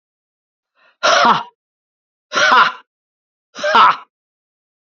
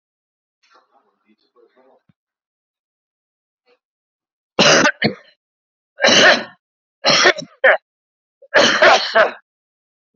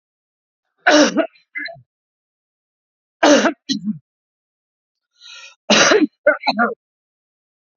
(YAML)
exhalation_length: 4.9 s
exhalation_amplitude: 32768
exhalation_signal_mean_std_ratio: 0.39
cough_length: 10.2 s
cough_amplitude: 32768
cough_signal_mean_std_ratio: 0.35
three_cough_length: 7.8 s
three_cough_amplitude: 29894
three_cough_signal_mean_std_ratio: 0.36
survey_phase: beta (2021-08-13 to 2022-03-07)
age: 45-64
gender: Male
wearing_mask: 'No'
symptom_none: true
symptom_onset: 11 days
smoker_status: Never smoked
respiratory_condition_asthma: false
respiratory_condition_other: false
recruitment_source: REACT
submission_delay: 2 days
covid_test_result: Negative
covid_test_method: RT-qPCR
influenza_a_test_result: Negative
influenza_b_test_result: Negative